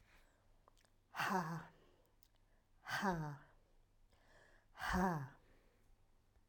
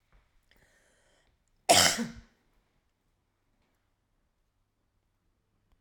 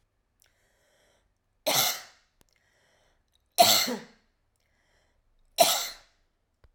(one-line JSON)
{"exhalation_length": "6.5 s", "exhalation_amplitude": 1794, "exhalation_signal_mean_std_ratio": 0.42, "cough_length": "5.8 s", "cough_amplitude": 16026, "cough_signal_mean_std_ratio": 0.19, "three_cough_length": "6.7 s", "three_cough_amplitude": 18813, "three_cough_signal_mean_std_ratio": 0.28, "survey_phase": "alpha (2021-03-01 to 2021-08-12)", "age": "45-64", "gender": "Female", "wearing_mask": "No", "symptom_cough_any": true, "symptom_fatigue": true, "symptom_fever_high_temperature": true, "symptom_headache": true, "symptom_onset": "4 days", "smoker_status": "Never smoked", "respiratory_condition_asthma": false, "respiratory_condition_other": false, "recruitment_source": "Test and Trace", "submission_delay": "2 days", "covid_test_result": "Positive", "covid_test_method": "RT-qPCR", "covid_ct_value": 14.6, "covid_ct_gene": "S gene", "covid_ct_mean": 15.2, "covid_viral_load": "10000000 copies/ml", "covid_viral_load_category": "High viral load (>1M copies/ml)"}